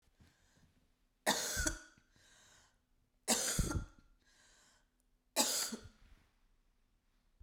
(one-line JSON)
{"three_cough_length": "7.4 s", "three_cough_amplitude": 4442, "three_cough_signal_mean_std_ratio": 0.36, "survey_phase": "beta (2021-08-13 to 2022-03-07)", "age": "45-64", "gender": "Female", "wearing_mask": "No", "symptom_cough_any": true, "symptom_runny_or_blocked_nose": true, "symptom_sore_throat": true, "symptom_diarrhoea": true, "symptom_fatigue": true, "symptom_fever_high_temperature": true, "symptom_headache": true, "symptom_other": true, "symptom_onset": "1 day", "smoker_status": "Never smoked", "respiratory_condition_asthma": false, "respiratory_condition_other": false, "recruitment_source": "Test and Trace", "submission_delay": "1 day", "covid_test_result": "Positive", "covid_test_method": "RT-qPCR", "covid_ct_value": 23.9, "covid_ct_gene": "ORF1ab gene"}